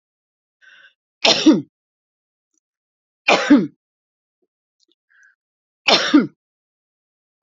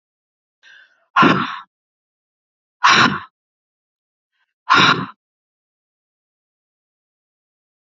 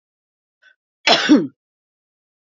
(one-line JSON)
{"three_cough_length": "7.4 s", "three_cough_amplitude": 32768, "three_cough_signal_mean_std_ratio": 0.28, "exhalation_length": "7.9 s", "exhalation_amplitude": 32767, "exhalation_signal_mean_std_ratio": 0.28, "cough_length": "2.6 s", "cough_amplitude": 29766, "cough_signal_mean_std_ratio": 0.29, "survey_phase": "beta (2021-08-13 to 2022-03-07)", "age": "65+", "gender": "Female", "wearing_mask": "No", "symptom_none": true, "smoker_status": "Ex-smoker", "respiratory_condition_asthma": false, "respiratory_condition_other": false, "recruitment_source": "REACT", "submission_delay": "2 days", "covid_test_result": "Positive", "covid_test_method": "RT-qPCR", "covid_ct_value": 34.0, "covid_ct_gene": "N gene", "influenza_a_test_result": "Negative", "influenza_b_test_result": "Negative"}